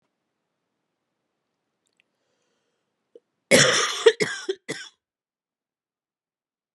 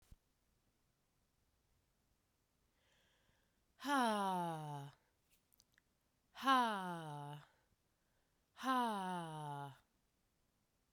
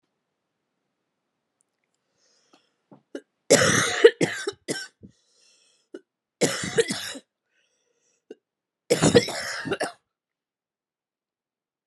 {
  "cough_length": "6.7 s",
  "cough_amplitude": 27760,
  "cough_signal_mean_std_ratio": 0.24,
  "exhalation_length": "10.9 s",
  "exhalation_amplitude": 2452,
  "exhalation_signal_mean_std_ratio": 0.39,
  "three_cough_length": "11.9 s",
  "three_cough_amplitude": 30531,
  "three_cough_signal_mean_std_ratio": 0.28,
  "survey_phase": "beta (2021-08-13 to 2022-03-07)",
  "age": "18-44",
  "gender": "Female",
  "wearing_mask": "No",
  "symptom_cough_any": true,
  "symptom_runny_or_blocked_nose": true,
  "symptom_fatigue": true,
  "symptom_headache": true,
  "symptom_change_to_sense_of_smell_or_taste": true,
  "symptom_onset": "3 days",
  "smoker_status": "Never smoked",
  "respiratory_condition_asthma": false,
  "respiratory_condition_other": false,
  "recruitment_source": "Test and Trace",
  "submission_delay": "2 days",
  "covid_test_result": "Positive",
  "covid_test_method": "RT-qPCR",
  "covid_ct_value": 16.9,
  "covid_ct_gene": "N gene"
}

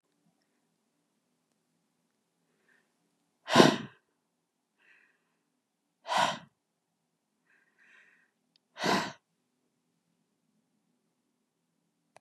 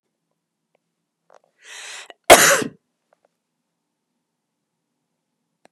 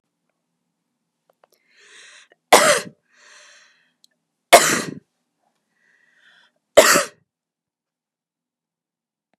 {
  "exhalation_length": "12.2 s",
  "exhalation_amplitude": 23404,
  "exhalation_signal_mean_std_ratio": 0.18,
  "cough_length": "5.7 s",
  "cough_amplitude": 32768,
  "cough_signal_mean_std_ratio": 0.18,
  "three_cough_length": "9.4 s",
  "three_cough_amplitude": 32768,
  "three_cough_signal_mean_std_ratio": 0.22,
  "survey_phase": "beta (2021-08-13 to 2022-03-07)",
  "age": "18-44",
  "gender": "Female",
  "wearing_mask": "No",
  "symptom_fatigue": true,
  "symptom_onset": "12 days",
  "smoker_status": "Ex-smoker",
  "respiratory_condition_asthma": false,
  "respiratory_condition_other": false,
  "recruitment_source": "REACT",
  "submission_delay": "2 days",
  "covid_test_result": "Negative",
  "covid_test_method": "RT-qPCR",
  "influenza_a_test_result": "Negative",
  "influenza_b_test_result": "Negative"
}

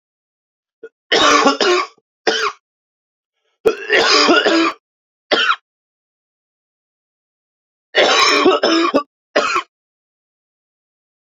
{
  "three_cough_length": "11.3 s",
  "three_cough_amplitude": 32767,
  "three_cough_signal_mean_std_ratio": 0.46,
  "survey_phase": "alpha (2021-03-01 to 2021-08-12)",
  "age": "18-44",
  "gender": "Male",
  "wearing_mask": "No",
  "symptom_cough_any": true,
  "symptom_fatigue": true,
  "symptom_fever_high_temperature": true,
  "symptom_headache": true,
  "smoker_status": "Never smoked",
  "respiratory_condition_asthma": false,
  "respiratory_condition_other": false,
  "recruitment_source": "Test and Trace",
  "submission_delay": "1 day",
  "covid_test_result": "Positive",
  "covid_test_method": "RT-qPCR",
  "covid_ct_value": 14.8,
  "covid_ct_gene": "ORF1ab gene",
  "covid_ct_mean": 16.3,
  "covid_viral_load": "4500000 copies/ml",
  "covid_viral_load_category": "High viral load (>1M copies/ml)"
}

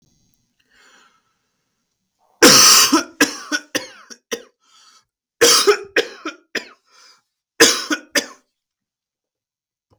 {
  "cough_length": "10.0 s",
  "cough_amplitude": 32768,
  "cough_signal_mean_std_ratio": 0.33,
  "survey_phase": "beta (2021-08-13 to 2022-03-07)",
  "age": "18-44",
  "gender": "Male",
  "wearing_mask": "No",
  "symptom_cough_any": true,
  "symptom_runny_or_blocked_nose": true,
  "symptom_sore_throat": true,
  "symptom_fatigue": true,
  "symptom_onset": "2 days",
  "smoker_status": "Never smoked",
  "respiratory_condition_asthma": false,
  "respiratory_condition_other": false,
  "recruitment_source": "Test and Trace",
  "submission_delay": "1 day",
  "covid_test_result": "Positive",
  "covid_test_method": "RT-qPCR",
  "covid_ct_value": 31.6,
  "covid_ct_gene": "N gene"
}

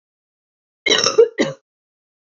{
  "cough_length": "2.2 s",
  "cough_amplitude": 27515,
  "cough_signal_mean_std_ratio": 0.34,
  "survey_phase": "beta (2021-08-13 to 2022-03-07)",
  "age": "18-44",
  "gender": "Female",
  "wearing_mask": "No",
  "symptom_runny_or_blocked_nose": true,
  "symptom_fatigue": true,
  "smoker_status": "Never smoked",
  "respiratory_condition_asthma": false,
  "respiratory_condition_other": false,
  "recruitment_source": "REACT",
  "submission_delay": "0 days",
  "covid_test_result": "Negative",
  "covid_test_method": "RT-qPCR",
  "influenza_a_test_result": "Negative",
  "influenza_b_test_result": "Negative"
}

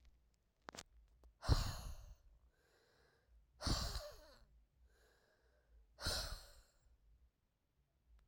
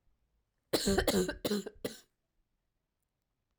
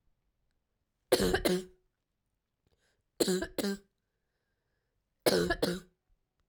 {
  "exhalation_length": "8.3 s",
  "exhalation_amplitude": 2855,
  "exhalation_signal_mean_std_ratio": 0.34,
  "cough_length": "3.6 s",
  "cough_amplitude": 5787,
  "cough_signal_mean_std_ratio": 0.38,
  "three_cough_length": "6.5 s",
  "three_cough_amplitude": 10875,
  "three_cough_signal_mean_std_ratio": 0.35,
  "survey_phase": "alpha (2021-03-01 to 2021-08-12)",
  "age": "18-44",
  "gender": "Female",
  "wearing_mask": "No",
  "symptom_cough_any": true,
  "symptom_fatigue": true,
  "symptom_fever_high_temperature": true,
  "symptom_headache": true,
  "symptom_change_to_sense_of_smell_or_taste": true,
  "symptom_loss_of_taste": true,
  "symptom_onset": "3 days",
  "smoker_status": "Never smoked",
  "respiratory_condition_asthma": true,
  "respiratory_condition_other": false,
  "recruitment_source": "Test and Trace",
  "submission_delay": "2 days",
  "covid_test_result": "Positive",
  "covid_test_method": "RT-qPCR",
  "covid_ct_value": 15.2,
  "covid_ct_gene": "ORF1ab gene",
  "covid_ct_mean": 15.7,
  "covid_viral_load": "7200000 copies/ml",
  "covid_viral_load_category": "High viral load (>1M copies/ml)"
}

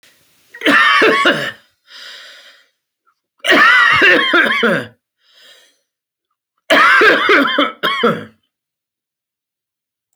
{
  "three_cough_length": "10.2 s",
  "three_cough_amplitude": 29499,
  "three_cough_signal_mean_std_ratio": 0.52,
  "survey_phase": "alpha (2021-03-01 to 2021-08-12)",
  "age": "45-64",
  "gender": "Male",
  "wearing_mask": "No",
  "symptom_shortness_of_breath": true,
  "symptom_abdominal_pain": true,
  "symptom_fatigue": true,
  "symptom_onset": "12 days",
  "smoker_status": "Never smoked",
  "respiratory_condition_asthma": false,
  "respiratory_condition_other": false,
  "recruitment_source": "REACT",
  "submission_delay": "2 days",
  "covid_test_result": "Negative",
  "covid_test_method": "RT-qPCR"
}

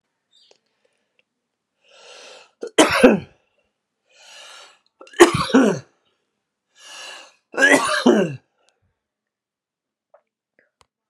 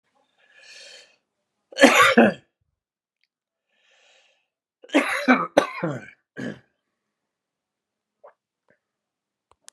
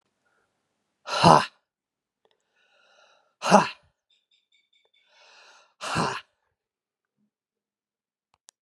{
  "three_cough_length": "11.1 s",
  "three_cough_amplitude": 32768,
  "three_cough_signal_mean_std_ratio": 0.29,
  "cough_length": "9.7 s",
  "cough_amplitude": 32767,
  "cough_signal_mean_std_ratio": 0.26,
  "exhalation_length": "8.6 s",
  "exhalation_amplitude": 32333,
  "exhalation_signal_mean_std_ratio": 0.21,
  "survey_phase": "alpha (2021-03-01 to 2021-08-12)",
  "age": "65+",
  "gender": "Male",
  "wearing_mask": "No",
  "symptom_cough_any": true,
  "symptom_fatigue": true,
  "symptom_headache": true,
  "symptom_change_to_sense_of_smell_or_taste": true,
  "symptom_loss_of_taste": true,
  "symptom_onset": "2 days",
  "smoker_status": "Ex-smoker",
  "respiratory_condition_asthma": true,
  "respiratory_condition_other": false,
  "recruitment_source": "Test and Trace",
  "submission_delay": "2 days",
  "covid_test_result": "Positive",
  "covid_test_method": "RT-qPCR"
}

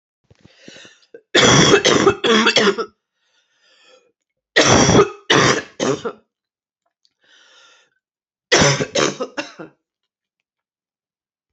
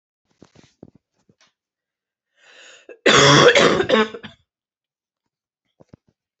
{
  "three_cough_length": "11.5 s",
  "three_cough_amplitude": 32767,
  "three_cough_signal_mean_std_ratio": 0.42,
  "cough_length": "6.4 s",
  "cough_amplitude": 29431,
  "cough_signal_mean_std_ratio": 0.32,
  "survey_phase": "beta (2021-08-13 to 2022-03-07)",
  "age": "18-44",
  "gender": "Female",
  "wearing_mask": "No",
  "symptom_sore_throat": true,
  "symptom_onset": "12 days",
  "smoker_status": "Ex-smoker",
  "respiratory_condition_asthma": true,
  "respiratory_condition_other": false,
  "recruitment_source": "REACT",
  "submission_delay": "2 days",
  "covid_test_result": "Negative",
  "covid_test_method": "RT-qPCR",
  "influenza_a_test_result": "Unknown/Void",
  "influenza_b_test_result": "Unknown/Void"
}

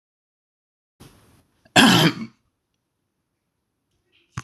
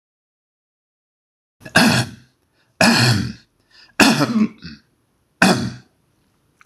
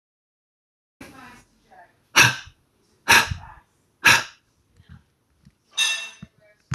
{
  "cough_length": "4.4 s",
  "cough_amplitude": 26027,
  "cough_signal_mean_std_ratio": 0.24,
  "three_cough_length": "6.7 s",
  "three_cough_amplitude": 26028,
  "three_cough_signal_mean_std_ratio": 0.39,
  "exhalation_length": "6.7 s",
  "exhalation_amplitude": 26027,
  "exhalation_signal_mean_std_ratio": 0.27,
  "survey_phase": "beta (2021-08-13 to 2022-03-07)",
  "age": "18-44",
  "gender": "Male",
  "wearing_mask": "No",
  "symptom_none": true,
  "smoker_status": "Never smoked",
  "respiratory_condition_asthma": false,
  "respiratory_condition_other": false,
  "recruitment_source": "REACT",
  "submission_delay": "2 days",
  "covid_test_result": "Negative",
  "covid_test_method": "RT-qPCR"
}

